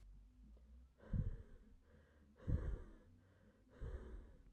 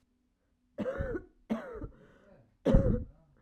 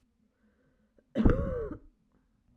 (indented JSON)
{
  "exhalation_length": "4.5 s",
  "exhalation_amplitude": 1169,
  "exhalation_signal_mean_std_ratio": 0.48,
  "three_cough_length": "3.4 s",
  "three_cough_amplitude": 9894,
  "three_cough_signal_mean_std_ratio": 0.39,
  "cough_length": "2.6 s",
  "cough_amplitude": 12414,
  "cough_signal_mean_std_ratio": 0.33,
  "survey_phase": "beta (2021-08-13 to 2022-03-07)",
  "age": "18-44",
  "gender": "Female",
  "wearing_mask": "No",
  "symptom_cough_any": true,
  "symptom_runny_or_blocked_nose": true,
  "symptom_abdominal_pain": true,
  "symptom_fatigue": true,
  "symptom_change_to_sense_of_smell_or_taste": true,
  "symptom_onset": "2 days",
  "smoker_status": "Current smoker (11 or more cigarettes per day)",
  "respiratory_condition_asthma": false,
  "respiratory_condition_other": false,
  "recruitment_source": "Test and Trace",
  "submission_delay": "2 days",
  "covid_test_result": "Positive",
  "covid_test_method": "RT-qPCR",
  "covid_ct_value": 23.3,
  "covid_ct_gene": "ORF1ab gene",
  "covid_ct_mean": 23.8,
  "covid_viral_load": "16000 copies/ml",
  "covid_viral_load_category": "Low viral load (10K-1M copies/ml)"
}